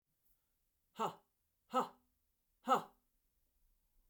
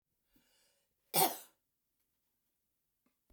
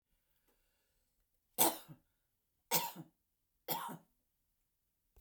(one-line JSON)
{"exhalation_length": "4.1 s", "exhalation_amplitude": 3005, "exhalation_signal_mean_std_ratio": 0.24, "cough_length": "3.3 s", "cough_amplitude": 5315, "cough_signal_mean_std_ratio": 0.19, "three_cough_length": "5.2 s", "three_cough_amplitude": 6667, "three_cough_signal_mean_std_ratio": 0.25, "survey_phase": "beta (2021-08-13 to 2022-03-07)", "age": "65+", "gender": "Female", "wearing_mask": "No", "symptom_none": true, "smoker_status": "Never smoked", "respiratory_condition_asthma": false, "respiratory_condition_other": false, "recruitment_source": "REACT", "submission_delay": "1 day", "covid_test_result": "Negative", "covid_test_method": "RT-qPCR"}